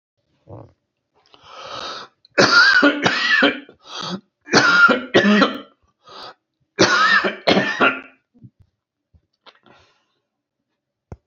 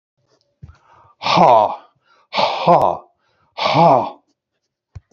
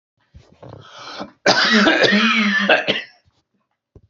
three_cough_length: 11.3 s
three_cough_amplitude: 32768
three_cough_signal_mean_std_ratio: 0.45
exhalation_length: 5.1 s
exhalation_amplitude: 29506
exhalation_signal_mean_std_ratio: 0.43
cough_length: 4.1 s
cough_amplitude: 32767
cough_signal_mean_std_ratio: 0.55
survey_phase: beta (2021-08-13 to 2022-03-07)
age: 65+
gender: Male
wearing_mask: 'No'
symptom_cough_any: true
symptom_runny_or_blocked_nose: true
symptom_onset: 12 days
smoker_status: Ex-smoker
respiratory_condition_asthma: false
respiratory_condition_other: true
recruitment_source: REACT
submission_delay: 1 day
covid_test_result: Negative
covid_test_method: RT-qPCR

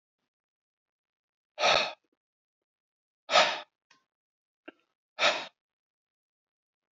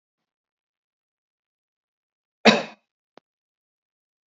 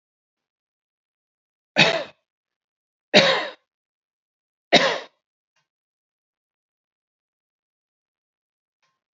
exhalation_length: 6.9 s
exhalation_amplitude: 12918
exhalation_signal_mean_std_ratio: 0.25
cough_length: 4.3 s
cough_amplitude: 28599
cough_signal_mean_std_ratio: 0.14
three_cough_length: 9.1 s
three_cough_amplitude: 30046
three_cough_signal_mean_std_ratio: 0.21
survey_phase: beta (2021-08-13 to 2022-03-07)
age: 65+
gender: Male
wearing_mask: 'No'
symptom_none: true
symptom_onset: 13 days
smoker_status: Ex-smoker
respiratory_condition_asthma: false
respiratory_condition_other: false
recruitment_source: REACT
submission_delay: 2 days
covid_test_result: Negative
covid_test_method: RT-qPCR
influenza_a_test_result: Negative
influenza_b_test_result: Negative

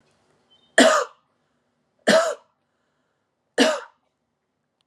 three_cough_length: 4.9 s
three_cough_amplitude: 30418
three_cough_signal_mean_std_ratio: 0.3
survey_phase: alpha (2021-03-01 to 2021-08-12)
age: 45-64
gender: Female
wearing_mask: 'Yes'
symptom_none: true
smoker_status: Ex-smoker
respiratory_condition_asthma: false
respiratory_condition_other: false
recruitment_source: Test and Trace
submission_delay: 0 days
covid_test_result: Negative
covid_test_method: LFT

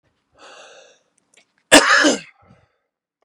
cough_length: 3.2 s
cough_amplitude: 32768
cough_signal_mean_std_ratio: 0.29
survey_phase: beta (2021-08-13 to 2022-03-07)
age: 45-64
gender: Male
wearing_mask: 'No'
symptom_none: true
smoker_status: Ex-smoker
respiratory_condition_asthma: true
respiratory_condition_other: false
recruitment_source: REACT
submission_delay: 3 days
covid_test_result: Negative
covid_test_method: RT-qPCR
influenza_a_test_result: Negative
influenza_b_test_result: Negative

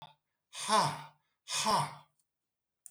exhalation_length: 2.9 s
exhalation_amplitude: 5158
exhalation_signal_mean_std_ratio: 0.43
survey_phase: beta (2021-08-13 to 2022-03-07)
age: 45-64
gender: Male
wearing_mask: 'No'
symptom_cough_any: true
symptom_headache: true
smoker_status: Ex-smoker
respiratory_condition_asthma: false
respiratory_condition_other: false
recruitment_source: REACT
submission_delay: 4 days
covid_test_result: Negative
covid_test_method: RT-qPCR
influenza_a_test_result: Negative
influenza_b_test_result: Negative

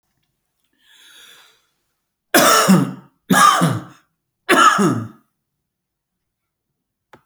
three_cough_length: 7.3 s
three_cough_amplitude: 31286
three_cough_signal_mean_std_ratio: 0.38
survey_phase: beta (2021-08-13 to 2022-03-07)
age: 45-64
gender: Male
wearing_mask: 'No'
symptom_none: true
smoker_status: Ex-smoker
respiratory_condition_asthma: false
respiratory_condition_other: false
recruitment_source: REACT
submission_delay: 1 day
covid_test_result: Negative
covid_test_method: RT-qPCR
influenza_a_test_result: Negative
influenza_b_test_result: Negative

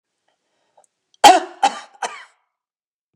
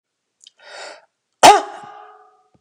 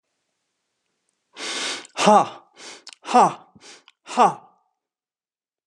three_cough_length: 3.2 s
three_cough_amplitude: 29204
three_cough_signal_mean_std_ratio: 0.24
cough_length: 2.6 s
cough_amplitude: 29204
cough_signal_mean_std_ratio: 0.24
exhalation_length: 5.7 s
exhalation_amplitude: 28251
exhalation_signal_mean_std_ratio: 0.31
survey_phase: beta (2021-08-13 to 2022-03-07)
age: 45-64
gender: Male
wearing_mask: 'No'
symptom_none: true
smoker_status: Never smoked
respiratory_condition_asthma: false
respiratory_condition_other: false
recruitment_source: REACT
submission_delay: 2 days
covid_test_result: Negative
covid_test_method: RT-qPCR
influenza_a_test_result: Negative
influenza_b_test_result: Negative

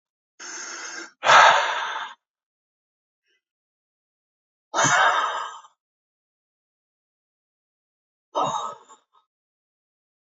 exhalation_length: 10.2 s
exhalation_amplitude: 27917
exhalation_signal_mean_std_ratio: 0.31
survey_phase: alpha (2021-03-01 to 2021-08-12)
age: 45-64
gender: Male
wearing_mask: 'No'
symptom_none: true
smoker_status: Never smoked
respiratory_condition_asthma: false
respiratory_condition_other: false
recruitment_source: REACT
submission_delay: 0 days
covid_test_result: Negative
covid_test_method: RT-qPCR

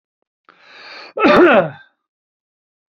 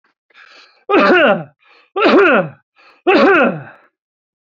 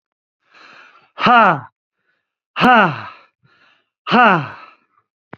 cough_length: 2.9 s
cough_amplitude: 29798
cough_signal_mean_std_ratio: 0.35
three_cough_length: 4.4 s
three_cough_amplitude: 29379
three_cough_signal_mean_std_ratio: 0.52
exhalation_length: 5.4 s
exhalation_amplitude: 32768
exhalation_signal_mean_std_ratio: 0.36
survey_phase: alpha (2021-03-01 to 2021-08-12)
age: 45-64
gender: Male
wearing_mask: 'No'
symptom_none: true
smoker_status: Ex-smoker
respiratory_condition_asthma: false
respiratory_condition_other: false
recruitment_source: REACT
submission_delay: 1 day
covid_test_result: Negative
covid_test_method: RT-qPCR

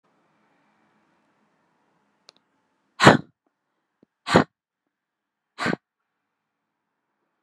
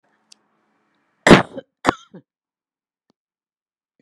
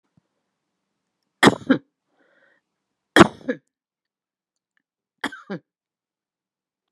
exhalation_length: 7.4 s
exhalation_amplitude: 32768
exhalation_signal_mean_std_ratio: 0.16
cough_length: 4.0 s
cough_amplitude: 32768
cough_signal_mean_std_ratio: 0.17
three_cough_length: 6.9 s
three_cough_amplitude: 32768
three_cough_signal_mean_std_ratio: 0.16
survey_phase: beta (2021-08-13 to 2022-03-07)
age: 65+
gender: Female
wearing_mask: 'No'
symptom_none: true
smoker_status: Never smoked
respiratory_condition_asthma: true
respiratory_condition_other: false
recruitment_source: REACT
submission_delay: 2 days
covid_test_result: Negative
covid_test_method: RT-qPCR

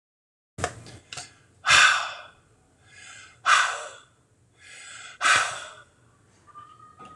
exhalation_length: 7.2 s
exhalation_amplitude: 22120
exhalation_signal_mean_std_ratio: 0.35
survey_phase: alpha (2021-03-01 to 2021-08-12)
age: 45-64
gender: Male
wearing_mask: 'No'
symptom_none: true
smoker_status: Current smoker (1 to 10 cigarettes per day)
respiratory_condition_asthma: false
respiratory_condition_other: false
recruitment_source: REACT
submission_delay: 2 days
covid_test_result: Negative
covid_test_method: RT-qPCR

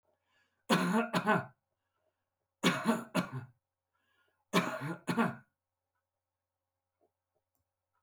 three_cough_length: 8.0 s
three_cough_amplitude: 7014
three_cough_signal_mean_std_ratio: 0.37
survey_phase: beta (2021-08-13 to 2022-03-07)
age: 65+
gender: Male
wearing_mask: 'No'
symptom_none: true
smoker_status: Never smoked
respiratory_condition_asthma: false
respiratory_condition_other: false
recruitment_source: REACT
submission_delay: 2 days
covid_test_result: Negative
covid_test_method: RT-qPCR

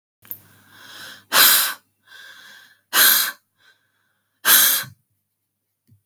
exhalation_length: 6.1 s
exhalation_amplitude: 32768
exhalation_signal_mean_std_ratio: 0.36
survey_phase: beta (2021-08-13 to 2022-03-07)
age: 45-64
gender: Female
wearing_mask: 'No'
symptom_none: true
smoker_status: Never smoked
respiratory_condition_asthma: false
respiratory_condition_other: false
recruitment_source: REACT
submission_delay: 2 days
covid_test_result: Negative
covid_test_method: RT-qPCR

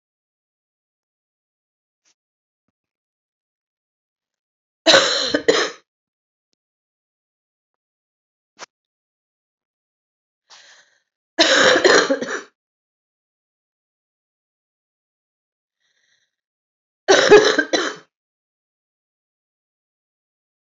three_cough_length: 20.7 s
three_cough_amplitude: 31141
three_cough_signal_mean_std_ratio: 0.24
survey_phase: alpha (2021-03-01 to 2021-08-12)
age: 45-64
gender: Female
wearing_mask: 'No'
symptom_cough_any: true
symptom_shortness_of_breath: true
symptom_fatigue: true
symptom_headache: true
symptom_onset: 3 days
smoker_status: Ex-smoker
respiratory_condition_asthma: true
respiratory_condition_other: false
recruitment_source: Test and Trace
submission_delay: 1 day
covid_test_result: Positive
covid_test_method: RT-qPCR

